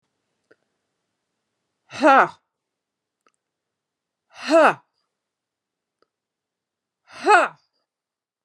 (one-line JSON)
{"exhalation_length": "8.4 s", "exhalation_amplitude": 30123, "exhalation_signal_mean_std_ratio": 0.23, "survey_phase": "alpha (2021-03-01 to 2021-08-12)", "age": "45-64", "gender": "Female", "wearing_mask": "No", "symptom_shortness_of_breath": true, "smoker_status": "Current smoker (1 to 10 cigarettes per day)", "respiratory_condition_asthma": false, "respiratory_condition_other": false, "recruitment_source": "REACT", "submission_delay": "3 days", "covid_test_result": "Negative", "covid_test_method": "RT-qPCR"}